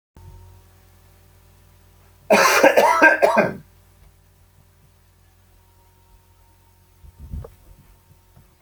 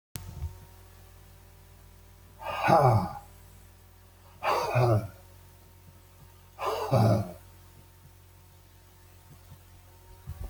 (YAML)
cough_length: 8.6 s
cough_amplitude: 32144
cough_signal_mean_std_ratio: 0.31
exhalation_length: 10.5 s
exhalation_amplitude: 13749
exhalation_signal_mean_std_ratio: 0.41
survey_phase: alpha (2021-03-01 to 2021-08-12)
age: 65+
gender: Male
wearing_mask: 'No'
symptom_none: true
smoker_status: Ex-smoker
respiratory_condition_asthma: false
respiratory_condition_other: false
recruitment_source: REACT
submission_delay: 3 days
covid_test_result: Negative
covid_test_method: RT-qPCR